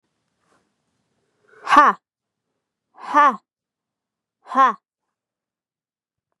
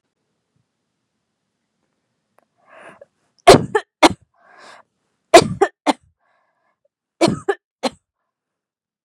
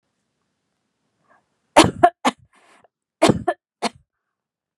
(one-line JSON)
{"exhalation_length": "6.4 s", "exhalation_amplitude": 32767, "exhalation_signal_mean_std_ratio": 0.25, "three_cough_length": "9.0 s", "three_cough_amplitude": 32768, "three_cough_signal_mean_std_ratio": 0.21, "cough_length": "4.8 s", "cough_amplitude": 32768, "cough_signal_mean_std_ratio": 0.23, "survey_phase": "beta (2021-08-13 to 2022-03-07)", "age": "18-44", "gender": "Female", "wearing_mask": "No", "symptom_none": true, "smoker_status": "Never smoked", "respiratory_condition_asthma": false, "respiratory_condition_other": false, "recruitment_source": "REACT", "submission_delay": "3 days", "covid_test_result": "Negative", "covid_test_method": "RT-qPCR", "influenza_a_test_result": "Unknown/Void", "influenza_b_test_result": "Unknown/Void"}